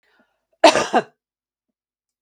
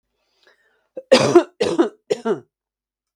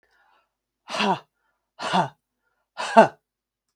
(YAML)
cough_length: 2.2 s
cough_amplitude: 32768
cough_signal_mean_std_ratio: 0.25
three_cough_length: 3.2 s
three_cough_amplitude: 32768
three_cough_signal_mean_std_ratio: 0.35
exhalation_length: 3.8 s
exhalation_amplitude: 32291
exhalation_signal_mean_std_ratio: 0.28
survey_phase: beta (2021-08-13 to 2022-03-07)
age: 45-64
gender: Female
wearing_mask: 'No'
symptom_sore_throat: true
smoker_status: Ex-smoker
respiratory_condition_asthma: false
respiratory_condition_other: false
recruitment_source: Test and Trace
submission_delay: 0 days
covid_test_result: Negative
covid_test_method: LFT